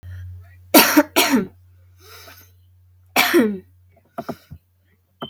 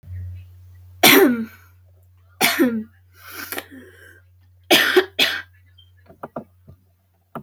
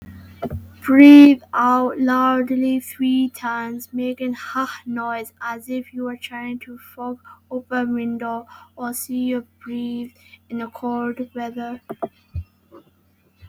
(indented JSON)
{
  "cough_length": "5.3 s",
  "cough_amplitude": 32768,
  "cough_signal_mean_std_ratio": 0.37,
  "three_cough_length": "7.4 s",
  "three_cough_amplitude": 32768,
  "three_cough_signal_mean_std_ratio": 0.38,
  "exhalation_length": "13.5 s",
  "exhalation_amplitude": 32768,
  "exhalation_signal_mean_std_ratio": 0.48,
  "survey_phase": "beta (2021-08-13 to 2022-03-07)",
  "age": "18-44",
  "gender": "Female",
  "wearing_mask": "No",
  "symptom_cough_any": true,
  "symptom_sore_throat": true,
  "symptom_headache": true,
  "smoker_status": "Never smoked",
  "respiratory_condition_asthma": false,
  "respiratory_condition_other": false,
  "recruitment_source": "REACT",
  "submission_delay": "2 days",
  "covid_test_result": "Negative",
  "covid_test_method": "RT-qPCR",
  "influenza_a_test_result": "Unknown/Void",
  "influenza_b_test_result": "Unknown/Void"
}